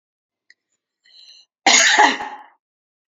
{"cough_length": "3.1 s", "cough_amplitude": 32536, "cough_signal_mean_std_ratio": 0.35, "survey_phase": "beta (2021-08-13 to 2022-03-07)", "age": "65+", "gender": "Female", "wearing_mask": "No", "symptom_none": true, "smoker_status": "Never smoked", "respiratory_condition_asthma": false, "respiratory_condition_other": false, "recruitment_source": "REACT", "submission_delay": "3 days", "covid_test_result": "Negative", "covid_test_method": "RT-qPCR", "influenza_a_test_result": "Negative", "influenza_b_test_result": "Negative"}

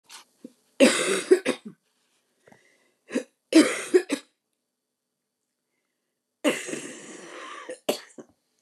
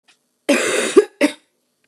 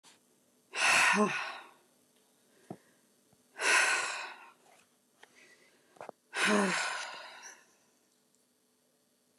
{"three_cough_length": "8.6 s", "three_cough_amplitude": 25712, "three_cough_signal_mean_std_ratio": 0.3, "cough_length": "1.9 s", "cough_amplitude": 29204, "cough_signal_mean_std_ratio": 0.42, "exhalation_length": "9.4 s", "exhalation_amplitude": 7276, "exhalation_signal_mean_std_ratio": 0.4, "survey_phase": "beta (2021-08-13 to 2022-03-07)", "age": "45-64", "gender": "Female", "wearing_mask": "No", "symptom_cough_any": true, "symptom_runny_or_blocked_nose": true, "symptom_onset": "7 days", "smoker_status": "Never smoked", "respiratory_condition_asthma": false, "respiratory_condition_other": false, "recruitment_source": "REACT", "submission_delay": "1 day", "covid_test_result": "Negative", "covid_test_method": "RT-qPCR"}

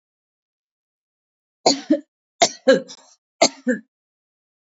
{"three_cough_length": "4.8 s", "three_cough_amplitude": 28789, "three_cough_signal_mean_std_ratio": 0.27, "survey_phase": "alpha (2021-03-01 to 2021-08-12)", "age": "45-64", "gender": "Female", "wearing_mask": "No", "symptom_cough_any": true, "symptom_onset": "6 days", "smoker_status": "Never smoked", "respiratory_condition_asthma": false, "respiratory_condition_other": false, "recruitment_source": "Test and Trace", "submission_delay": "2 days", "covid_test_result": "Positive", "covid_test_method": "RT-qPCR"}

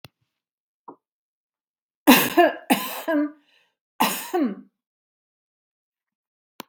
{"three_cough_length": "6.7 s", "three_cough_amplitude": 32767, "three_cough_signal_mean_std_ratio": 0.31, "survey_phase": "beta (2021-08-13 to 2022-03-07)", "age": "65+", "gender": "Female", "wearing_mask": "No", "symptom_none": true, "smoker_status": "Ex-smoker", "respiratory_condition_asthma": false, "respiratory_condition_other": false, "recruitment_source": "Test and Trace", "submission_delay": "3 days", "covid_test_result": "Negative", "covid_test_method": "RT-qPCR"}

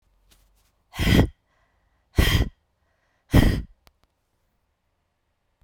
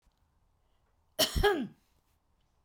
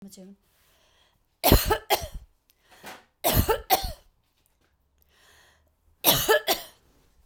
{"exhalation_length": "5.6 s", "exhalation_amplitude": 25498, "exhalation_signal_mean_std_ratio": 0.31, "cough_length": "2.6 s", "cough_amplitude": 8143, "cough_signal_mean_std_ratio": 0.32, "three_cough_length": "7.3 s", "three_cough_amplitude": 28442, "three_cough_signal_mean_std_ratio": 0.34, "survey_phase": "beta (2021-08-13 to 2022-03-07)", "age": "45-64", "gender": "Female", "wearing_mask": "No", "symptom_none": true, "smoker_status": "Never smoked", "respiratory_condition_asthma": false, "respiratory_condition_other": false, "recruitment_source": "REACT", "submission_delay": "1 day", "covid_test_result": "Negative", "covid_test_method": "RT-qPCR"}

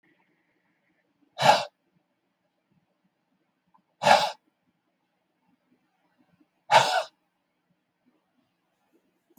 {"exhalation_length": "9.4 s", "exhalation_amplitude": 22354, "exhalation_signal_mean_std_ratio": 0.22, "survey_phase": "beta (2021-08-13 to 2022-03-07)", "age": "65+", "gender": "Male", "wearing_mask": "No", "symptom_none": true, "smoker_status": "Ex-smoker", "respiratory_condition_asthma": false, "respiratory_condition_other": false, "recruitment_source": "REACT", "submission_delay": "3 days", "covid_test_result": "Negative", "covid_test_method": "RT-qPCR", "influenza_a_test_result": "Unknown/Void", "influenza_b_test_result": "Unknown/Void"}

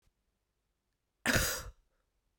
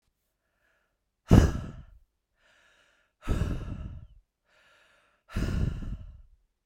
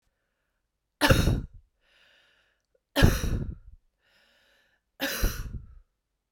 {"cough_length": "2.4 s", "cough_amplitude": 8192, "cough_signal_mean_std_ratio": 0.31, "exhalation_length": "6.7 s", "exhalation_amplitude": 25325, "exhalation_signal_mean_std_ratio": 0.3, "three_cough_length": "6.3 s", "three_cough_amplitude": 21519, "three_cough_signal_mean_std_ratio": 0.34, "survey_phase": "beta (2021-08-13 to 2022-03-07)", "age": "45-64", "gender": "Female", "wearing_mask": "No", "symptom_change_to_sense_of_smell_or_taste": true, "symptom_onset": "6 days", "smoker_status": "Never smoked", "respiratory_condition_asthma": false, "respiratory_condition_other": false, "recruitment_source": "Test and Trace", "submission_delay": "2 days", "covid_test_result": "Positive", "covid_test_method": "ePCR"}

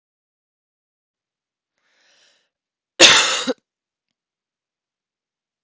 {"cough_length": "5.6 s", "cough_amplitude": 32768, "cough_signal_mean_std_ratio": 0.2, "survey_phase": "beta (2021-08-13 to 2022-03-07)", "age": "45-64", "gender": "Female", "wearing_mask": "No", "symptom_cough_any": true, "symptom_fatigue": true, "symptom_fever_high_temperature": true, "symptom_headache": true, "symptom_other": true, "smoker_status": "Never smoked", "respiratory_condition_asthma": false, "respiratory_condition_other": false, "recruitment_source": "Test and Trace", "submission_delay": "1 day", "covid_test_result": "Positive", "covid_test_method": "RT-qPCR", "covid_ct_value": 24.3, "covid_ct_gene": "ORF1ab gene", "covid_ct_mean": 24.6, "covid_viral_load": "8500 copies/ml", "covid_viral_load_category": "Minimal viral load (< 10K copies/ml)"}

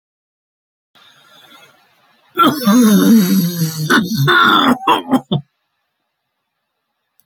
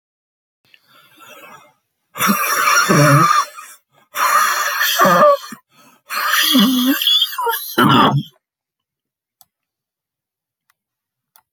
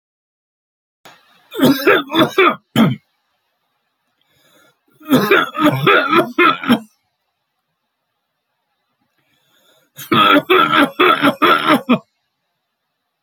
{"cough_length": "7.3 s", "cough_amplitude": 29171, "cough_signal_mean_std_ratio": 0.53, "exhalation_length": "11.5 s", "exhalation_amplitude": 30719, "exhalation_signal_mean_std_ratio": 0.54, "three_cough_length": "13.2 s", "three_cough_amplitude": 31345, "three_cough_signal_mean_std_ratio": 0.45, "survey_phase": "beta (2021-08-13 to 2022-03-07)", "age": "65+", "gender": "Male", "wearing_mask": "No", "symptom_shortness_of_breath": true, "smoker_status": "Ex-smoker", "respiratory_condition_asthma": true, "respiratory_condition_other": true, "recruitment_source": "REACT", "submission_delay": "1 day", "covid_test_result": "Negative", "covid_test_method": "RT-qPCR", "influenza_a_test_result": "Unknown/Void", "influenza_b_test_result": "Unknown/Void"}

